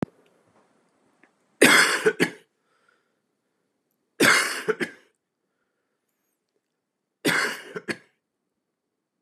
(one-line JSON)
{"three_cough_length": "9.2 s", "three_cough_amplitude": 27891, "three_cough_signal_mean_std_ratio": 0.3, "survey_phase": "beta (2021-08-13 to 2022-03-07)", "age": "45-64", "gender": "Male", "wearing_mask": "No", "symptom_none": true, "smoker_status": "Never smoked", "respiratory_condition_asthma": false, "respiratory_condition_other": false, "recruitment_source": "REACT", "submission_delay": "1 day", "covid_test_result": "Negative", "covid_test_method": "RT-qPCR", "influenza_a_test_result": "Negative", "influenza_b_test_result": "Negative"}